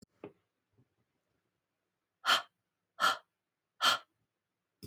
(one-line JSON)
{"exhalation_length": "4.9 s", "exhalation_amplitude": 6861, "exhalation_signal_mean_std_ratio": 0.25, "survey_phase": "beta (2021-08-13 to 2022-03-07)", "age": "45-64", "gender": "Female", "wearing_mask": "No", "symptom_cough_any": true, "symptom_onset": "5 days", "smoker_status": "Never smoked", "respiratory_condition_asthma": false, "respiratory_condition_other": false, "recruitment_source": "Test and Trace", "submission_delay": "1 day", "covid_test_result": "Negative", "covid_test_method": "RT-qPCR"}